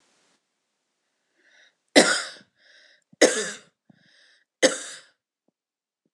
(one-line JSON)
{"three_cough_length": "6.1 s", "three_cough_amplitude": 26028, "three_cough_signal_mean_std_ratio": 0.23, "survey_phase": "alpha (2021-03-01 to 2021-08-12)", "age": "18-44", "gender": "Female", "wearing_mask": "No", "symptom_none": true, "symptom_onset": "5 days", "smoker_status": "Never smoked", "respiratory_condition_asthma": false, "respiratory_condition_other": false, "recruitment_source": "REACT", "submission_delay": "3 days", "covid_test_result": "Negative", "covid_test_method": "RT-qPCR"}